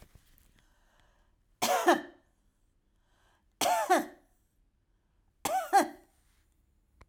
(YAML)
three_cough_length: 7.1 s
three_cough_amplitude: 8524
three_cough_signal_mean_std_ratio: 0.32
survey_phase: beta (2021-08-13 to 2022-03-07)
age: 65+
gender: Female
wearing_mask: 'No'
symptom_none: true
smoker_status: Never smoked
respiratory_condition_asthma: false
respiratory_condition_other: false
recruitment_source: REACT
submission_delay: 2 days
covid_test_result: Negative
covid_test_method: RT-qPCR
influenza_a_test_result: Negative
influenza_b_test_result: Negative